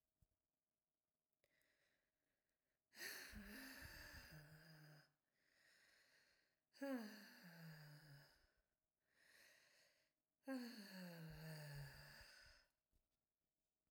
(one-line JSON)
{"exhalation_length": "13.9 s", "exhalation_amplitude": 361, "exhalation_signal_mean_std_ratio": 0.5, "survey_phase": "beta (2021-08-13 to 2022-03-07)", "age": "45-64", "gender": "Female", "wearing_mask": "No", "symptom_cough_any": true, "symptom_runny_or_blocked_nose": true, "symptom_shortness_of_breath": true, "symptom_fatigue": true, "symptom_fever_high_temperature": true, "symptom_headache": true, "symptom_change_to_sense_of_smell_or_taste": true, "symptom_loss_of_taste": true, "smoker_status": "Never smoked", "respiratory_condition_asthma": true, "respiratory_condition_other": false, "recruitment_source": "Test and Trace", "submission_delay": "2 days", "covid_test_result": "Positive", "covid_test_method": "RT-qPCR"}